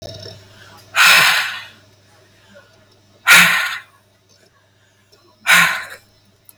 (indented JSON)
{
  "exhalation_length": "6.6 s",
  "exhalation_amplitude": 32768,
  "exhalation_signal_mean_std_ratio": 0.38,
  "survey_phase": "beta (2021-08-13 to 2022-03-07)",
  "age": "18-44",
  "gender": "Male",
  "wearing_mask": "No",
  "symptom_none": true,
  "smoker_status": "Current smoker (11 or more cigarettes per day)",
  "respiratory_condition_asthma": false,
  "respiratory_condition_other": false,
  "recruitment_source": "REACT",
  "submission_delay": "1 day",
  "covid_test_result": "Negative",
  "covid_test_method": "RT-qPCR",
  "influenza_a_test_result": "Negative",
  "influenza_b_test_result": "Negative"
}